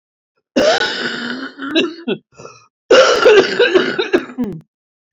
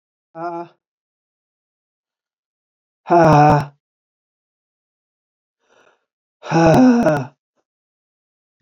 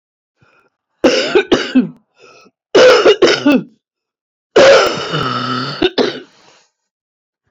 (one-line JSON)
{"cough_length": "5.1 s", "cough_amplitude": 28506, "cough_signal_mean_std_ratio": 0.57, "exhalation_length": "8.6 s", "exhalation_amplitude": 27567, "exhalation_signal_mean_std_ratio": 0.34, "three_cough_length": "7.5 s", "three_cough_amplitude": 31707, "three_cough_signal_mean_std_ratio": 0.49, "survey_phase": "beta (2021-08-13 to 2022-03-07)", "age": "65+", "gender": "Female", "wearing_mask": "No", "symptom_cough_any": true, "symptom_new_continuous_cough": true, "symptom_runny_or_blocked_nose": true, "symptom_headache": true, "smoker_status": "Ex-smoker", "respiratory_condition_asthma": true, "respiratory_condition_other": false, "recruitment_source": "REACT", "submission_delay": "3 days", "covid_test_result": "Negative", "covid_test_method": "RT-qPCR", "influenza_a_test_result": "Negative", "influenza_b_test_result": "Negative"}